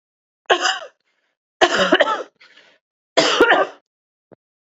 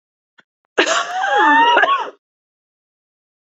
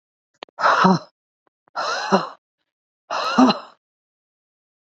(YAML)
three_cough_length: 4.8 s
three_cough_amplitude: 31150
three_cough_signal_mean_std_ratio: 0.4
cough_length: 3.6 s
cough_amplitude: 28627
cough_signal_mean_std_ratio: 0.5
exhalation_length: 4.9 s
exhalation_amplitude: 27267
exhalation_signal_mean_std_ratio: 0.39
survey_phase: beta (2021-08-13 to 2022-03-07)
age: 45-64
gender: Female
wearing_mask: 'Yes'
symptom_runny_or_blocked_nose: true
symptom_shortness_of_breath: true
symptom_sore_throat: true
symptom_onset: 4 days
smoker_status: Never smoked
respiratory_condition_asthma: false
respiratory_condition_other: false
recruitment_source: Test and Trace
submission_delay: 2 days
covid_test_result: Positive
covid_test_method: RT-qPCR
covid_ct_value: 16.5
covid_ct_gene: ORF1ab gene